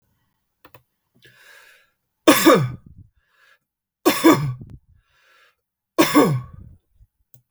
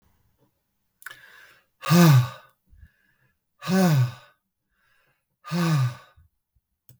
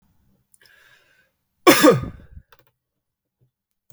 {"three_cough_length": "7.5 s", "three_cough_amplitude": 32768, "three_cough_signal_mean_std_ratio": 0.32, "exhalation_length": "7.0 s", "exhalation_amplitude": 22203, "exhalation_signal_mean_std_ratio": 0.36, "cough_length": "3.9 s", "cough_amplitude": 32768, "cough_signal_mean_std_ratio": 0.24, "survey_phase": "beta (2021-08-13 to 2022-03-07)", "age": "45-64", "gender": "Male", "wearing_mask": "No", "symptom_none": true, "smoker_status": "Never smoked", "respiratory_condition_asthma": false, "respiratory_condition_other": false, "recruitment_source": "REACT", "submission_delay": "1 day", "covid_test_result": "Positive", "covid_test_method": "RT-qPCR", "covid_ct_value": 30.0, "covid_ct_gene": "N gene", "influenza_a_test_result": "Unknown/Void", "influenza_b_test_result": "Unknown/Void"}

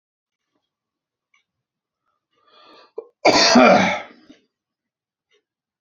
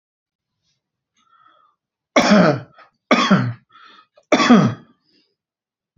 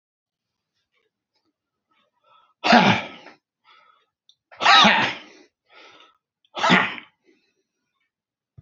{"cough_length": "5.8 s", "cough_amplitude": 31963, "cough_signal_mean_std_ratio": 0.29, "three_cough_length": "6.0 s", "three_cough_amplitude": 32767, "three_cough_signal_mean_std_ratio": 0.36, "exhalation_length": "8.6 s", "exhalation_amplitude": 28815, "exhalation_signal_mean_std_ratio": 0.29, "survey_phase": "beta (2021-08-13 to 2022-03-07)", "age": "45-64", "gender": "Male", "wearing_mask": "No", "symptom_none": true, "smoker_status": "Never smoked", "respiratory_condition_asthma": false, "respiratory_condition_other": false, "recruitment_source": "REACT", "submission_delay": "0 days", "covid_test_result": "Negative", "covid_test_method": "RT-qPCR"}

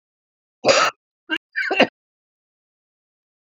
{"cough_length": "3.6 s", "cough_amplitude": 28738, "cough_signal_mean_std_ratio": 0.3, "survey_phase": "beta (2021-08-13 to 2022-03-07)", "age": "45-64", "gender": "Female", "wearing_mask": "No", "symptom_cough_any": true, "symptom_runny_or_blocked_nose": true, "symptom_headache": true, "symptom_onset": "4 days", "smoker_status": "Ex-smoker", "respiratory_condition_asthma": false, "respiratory_condition_other": false, "recruitment_source": "Test and Trace", "submission_delay": "1 day", "covid_test_result": "Positive", "covid_test_method": "RT-qPCR", "covid_ct_value": 23.1, "covid_ct_gene": "ORF1ab gene"}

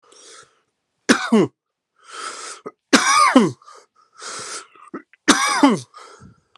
{"three_cough_length": "6.6 s", "three_cough_amplitude": 32767, "three_cough_signal_mean_std_ratio": 0.4, "survey_phase": "alpha (2021-03-01 to 2021-08-12)", "age": "45-64", "gender": "Male", "wearing_mask": "No", "symptom_none": true, "smoker_status": "Ex-smoker", "respiratory_condition_asthma": true, "respiratory_condition_other": false, "recruitment_source": "REACT", "submission_delay": "35 days", "covid_test_result": "Negative", "covid_test_method": "RT-qPCR"}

